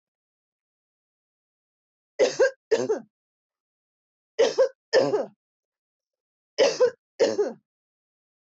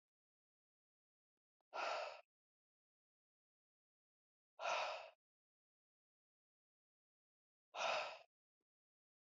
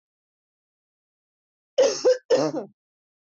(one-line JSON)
{"three_cough_length": "8.5 s", "three_cough_amplitude": 10371, "three_cough_signal_mean_std_ratio": 0.34, "exhalation_length": "9.4 s", "exhalation_amplitude": 1264, "exhalation_signal_mean_std_ratio": 0.29, "cough_length": "3.2 s", "cough_amplitude": 10176, "cough_signal_mean_std_ratio": 0.35, "survey_phase": "beta (2021-08-13 to 2022-03-07)", "age": "18-44", "gender": "Female", "wearing_mask": "No", "symptom_none": true, "smoker_status": "Ex-smoker", "respiratory_condition_asthma": true, "respiratory_condition_other": false, "recruitment_source": "REACT", "submission_delay": "3 days", "covid_test_result": "Negative", "covid_test_method": "RT-qPCR"}